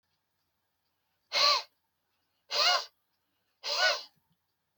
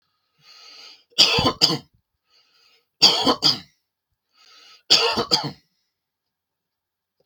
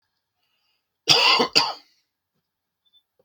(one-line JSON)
{"exhalation_length": "4.8 s", "exhalation_amplitude": 9297, "exhalation_signal_mean_std_ratio": 0.35, "three_cough_length": "7.3 s", "three_cough_amplitude": 32768, "three_cough_signal_mean_std_ratio": 0.34, "cough_length": "3.2 s", "cough_amplitude": 32766, "cough_signal_mean_std_ratio": 0.32, "survey_phase": "beta (2021-08-13 to 2022-03-07)", "age": "45-64", "gender": "Male", "wearing_mask": "No", "symptom_none": true, "smoker_status": "Never smoked", "respiratory_condition_asthma": false, "respiratory_condition_other": false, "recruitment_source": "REACT", "submission_delay": "3 days", "covid_test_result": "Negative", "covid_test_method": "RT-qPCR", "influenza_a_test_result": "Negative", "influenza_b_test_result": "Negative"}